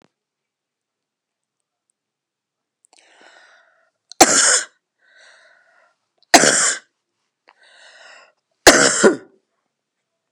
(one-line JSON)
{"three_cough_length": "10.3 s", "three_cough_amplitude": 32768, "three_cough_signal_mean_std_ratio": 0.26, "survey_phase": "beta (2021-08-13 to 2022-03-07)", "age": "45-64", "gender": "Female", "wearing_mask": "No", "symptom_fatigue": true, "symptom_change_to_sense_of_smell_or_taste": true, "symptom_loss_of_taste": true, "symptom_onset": "5 days", "smoker_status": "Ex-smoker", "respiratory_condition_asthma": false, "respiratory_condition_other": false, "recruitment_source": "Test and Trace", "submission_delay": "2 days", "covid_test_result": "Positive", "covid_test_method": "RT-qPCR", "covid_ct_value": 18.5, "covid_ct_gene": "ORF1ab gene", "covid_ct_mean": 19.1, "covid_viral_load": "550000 copies/ml", "covid_viral_load_category": "Low viral load (10K-1M copies/ml)"}